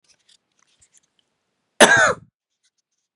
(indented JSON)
{
  "cough_length": "3.2 s",
  "cough_amplitude": 32768,
  "cough_signal_mean_std_ratio": 0.25,
  "survey_phase": "beta (2021-08-13 to 2022-03-07)",
  "age": "18-44",
  "gender": "Male",
  "wearing_mask": "No",
  "symptom_cough_any": true,
  "symptom_runny_or_blocked_nose": true,
  "symptom_shortness_of_breath": true,
  "symptom_sore_throat": true,
  "symptom_fatigue": true,
  "symptom_headache": true,
  "symptom_change_to_sense_of_smell_or_taste": true,
  "symptom_loss_of_taste": true,
  "symptom_onset": "5 days",
  "smoker_status": "Never smoked",
  "respiratory_condition_asthma": false,
  "respiratory_condition_other": false,
  "recruitment_source": "Test and Trace",
  "submission_delay": "1 day",
  "covid_test_result": "Positive",
  "covid_test_method": "RT-qPCR",
  "covid_ct_value": 16.3,
  "covid_ct_gene": "ORF1ab gene",
  "covid_ct_mean": 16.8,
  "covid_viral_load": "3100000 copies/ml",
  "covid_viral_load_category": "High viral load (>1M copies/ml)"
}